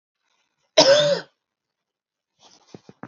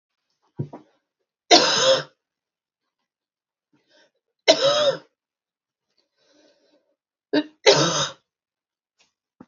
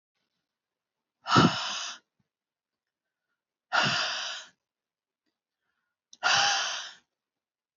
{"cough_length": "3.1 s", "cough_amplitude": 29645, "cough_signal_mean_std_ratio": 0.3, "three_cough_length": "9.5 s", "three_cough_amplitude": 30512, "three_cough_signal_mean_std_ratio": 0.3, "exhalation_length": "7.8 s", "exhalation_amplitude": 17044, "exhalation_signal_mean_std_ratio": 0.35, "survey_phase": "beta (2021-08-13 to 2022-03-07)", "age": "45-64", "gender": "Female", "wearing_mask": "No", "symptom_cough_any": true, "symptom_runny_or_blocked_nose": true, "symptom_sore_throat": true, "symptom_fatigue": true, "smoker_status": "Never smoked", "respiratory_condition_asthma": false, "respiratory_condition_other": false, "recruitment_source": "Test and Trace", "submission_delay": "1 day", "covid_test_result": "Positive", "covid_test_method": "RT-qPCR", "covid_ct_value": 21.3, "covid_ct_gene": "N gene"}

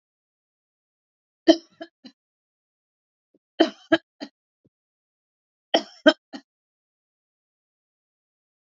{"three_cough_length": "8.8 s", "three_cough_amplitude": 28369, "three_cough_signal_mean_std_ratio": 0.15, "survey_phase": "beta (2021-08-13 to 2022-03-07)", "age": "45-64", "gender": "Female", "wearing_mask": "No", "symptom_none": true, "smoker_status": "Never smoked", "respiratory_condition_asthma": false, "respiratory_condition_other": false, "recruitment_source": "REACT", "submission_delay": "3 days", "covid_test_result": "Negative", "covid_test_method": "RT-qPCR", "influenza_a_test_result": "Negative", "influenza_b_test_result": "Negative"}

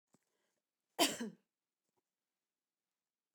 {"cough_length": "3.3 s", "cough_amplitude": 4507, "cough_signal_mean_std_ratio": 0.19, "survey_phase": "beta (2021-08-13 to 2022-03-07)", "age": "45-64", "gender": "Female", "wearing_mask": "No", "symptom_none": true, "smoker_status": "Never smoked", "respiratory_condition_asthma": false, "respiratory_condition_other": false, "recruitment_source": "REACT", "submission_delay": "2 days", "covid_test_result": "Negative", "covid_test_method": "RT-qPCR"}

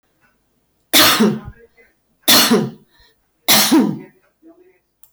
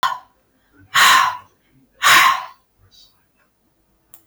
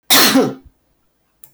{"three_cough_length": "5.1 s", "three_cough_amplitude": 30421, "three_cough_signal_mean_std_ratio": 0.45, "exhalation_length": "4.3 s", "exhalation_amplitude": 22825, "exhalation_signal_mean_std_ratio": 0.39, "cough_length": "1.5 s", "cough_amplitude": 27041, "cough_signal_mean_std_ratio": 0.47, "survey_phase": "beta (2021-08-13 to 2022-03-07)", "age": "65+", "gender": "Female", "wearing_mask": "No", "symptom_none": true, "smoker_status": "Never smoked", "respiratory_condition_asthma": false, "respiratory_condition_other": false, "recruitment_source": "REACT", "submission_delay": "2 days", "covid_test_result": "Negative", "covid_test_method": "RT-qPCR", "influenza_a_test_result": "Negative", "influenza_b_test_result": "Negative"}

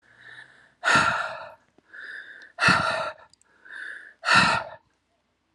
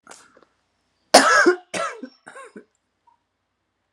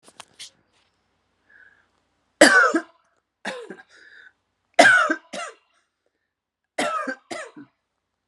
{"exhalation_length": "5.5 s", "exhalation_amplitude": 19760, "exhalation_signal_mean_std_ratio": 0.44, "cough_length": "3.9 s", "cough_amplitude": 32768, "cough_signal_mean_std_ratio": 0.29, "three_cough_length": "8.3 s", "three_cough_amplitude": 32768, "three_cough_signal_mean_std_ratio": 0.29, "survey_phase": "alpha (2021-03-01 to 2021-08-12)", "age": "45-64", "gender": "Female", "wearing_mask": "No", "symptom_none": true, "symptom_cough_any": true, "smoker_status": "Ex-smoker", "respiratory_condition_asthma": false, "respiratory_condition_other": false, "recruitment_source": "REACT", "submission_delay": "2 days", "covid_test_result": "Negative", "covid_test_method": "RT-qPCR"}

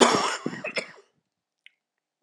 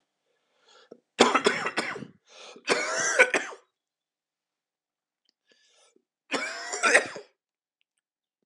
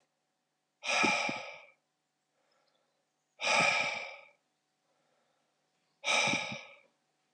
{"cough_length": "2.2 s", "cough_amplitude": 25348, "cough_signal_mean_std_ratio": 0.36, "three_cough_length": "8.5 s", "three_cough_amplitude": 22291, "three_cough_signal_mean_std_ratio": 0.34, "exhalation_length": "7.3 s", "exhalation_amplitude": 6253, "exhalation_signal_mean_std_ratio": 0.4, "survey_phase": "alpha (2021-03-01 to 2021-08-12)", "age": "45-64", "gender": "Male", "wearing_mask": "No", "symptom_cough_any": true, "symptom_change_to_sense_of_smell_or_taste": true, "symptom_loss_of_taste": true, "symptom_onset": "4 days", "smoker_status": "Never smoked", "respiratory_condition_asthma": false, "respiratory_condition_other": false, "recruitment_source": "Test and Trace", "submission_delay": "2 days", "covid_test_result": "Positive", "covid_test_method": "RT-qPCR"}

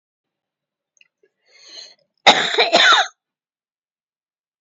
{"cough_length": "4.6 s", "cough_amplitude": 31110, "cough_signal_mean_std_ratio": 0.31, "survey_phase": "beta (2021-08-13 to 2022-03-07)", "age": "65+", "gender": "Female", "wearing_mask": "No", "symptom_none": true, "smoker_status": "Ex-smoker", "respiratory_condition_asthma": false, "respiratory_condition_other": false, "recruitment_source": "REACT", "submission_delay": "1 day", "covid_test_result": "Negative", "covid_test_method": "RT-qPCR", "influenza_a_test_result": "Negative", "influenza_b_test_result": "Negative"}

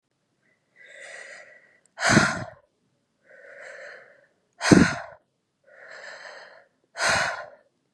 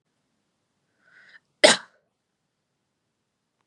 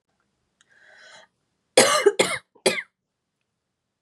{"exhalation_length": "7.9 s", "exhalation_amplitude": 30498, "exhalation_signal_mean_std_ratio": 0.3, "cough_length": "3.7 s", "cough_amplitude": 31349, "cough_signal_mean_std_ratio": 0.14, "three_cough_length": "4.0 s", "three_cough_amplitude": 29808, "three_cough_signal_mean_std_ratio": 0.29, "survey_phase": "beta (2021-08-13 to 2022-03-07)", "age": "18-44", "gender": "Female", "wearing_mask": "Yes", "symptom_fever_high_temperature": true, "symptom_headache": true, "smoker_status": "Never smoked", "respiratory_condition_asthma": false, "respiratory_condition_other": false, "recruitment_source": "REACT", "submission_delay": "1 day", "covid_test_result": "Negative", "covid_test_method": "RT-qPCR"}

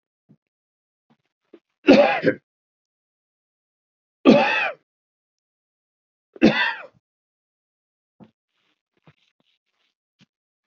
{"three_cough_length": "10.7 s", "three_cough_amplitude": 27902, "three_cough_signal_mean_std_ratio": 0.24, "survey_phase": "beta (2021-08-13 to 2022-03-07)", "age": "65+", "gender": "Male", "wearing_mask": "No", "symptom_abdominal_pain": true, "symptom_onset": "10 days", "smoker_status": "Never smoked", "respiratory_condition_asthma": false, "respiratory_condition_other": false, "recruitment_source": "REACT", "submission_delay": "2 days", "covid_test_result": "Negative", "covid_test_method": "RT-qPCR", "influenza_a_test_result": "Negative", "influenza_b_test_result": "Negative"}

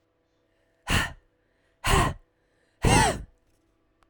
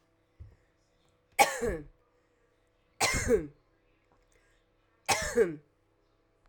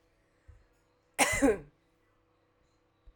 {"exhalation_length": "4.1 s", "exhalation_amplitude": 18761, "exhalation_signal_mean_std_ratio": 0.37, "three_cough_length": "6.5 s", "three_cough_amplitude": 15076, "three_cough_signal_mean_std_ratio": 0.33, "cough_length": "3.2 s", "cough_amplitude": 9245, "cough_signal_mean_std_ratio": 0.28, "survey_phase": "alpha (2021-03-01 to 2021-08-12)", "age": "45-64", "gender": "Female", "wearing_mask": "No", "symptom_headache": true, "smoker_status": "Never smoked", "respiratory_condition_asthma": false, "respiratory_condition_other": false, "recruitment_source": "Test and Trace", "submission_delay": "2 days", "covid_test_result": "Positive", "covid_test_method": "RT-qPCR", "covid_ct_value": 18.7, "covid_ct_gene": "ORF1ab gene", "covid_ct_mean": 19.0, "covid_viral_load": "570000 copies/ml", "covid_viral_load_category": "Low viral load (10K-1M copies/ml)"}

